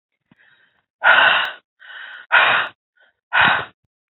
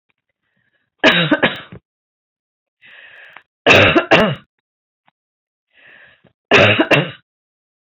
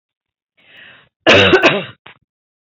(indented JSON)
{
  "exhalation_length": "4.1 s",
  "exhalation_amplitude": 27776,
  "exhalation_signal_mean_std_ratio": 0.44,
  "three_cough_length": "7.9 s",
  "three_cough_amplitude": 32768,
  "three_cough_signal_mean_std_ratio": 0.36,
  "cough_length": "2.7 s",
  "cough_amplitude": 30089,
  "cough_signal_mean_std_ratio": 0.37,
  "survey_phase": "alpha (2021-03-01 to 2021-08-12)",
  "age": "45-64",
  "gender": "Female",
  "wearing_mask": "No",
  "symptom_none": true,
  "smoker_status": "Ex-smoker",
  "respiratory_condition_asthma": false,
  "respiratory_condition_other": false,
  "recruitment_source": "REACT",
  "submission_delay": "1 day",
  "covid_test_result": "Negative",
  "covid_test_method": "RT-qPCR"
}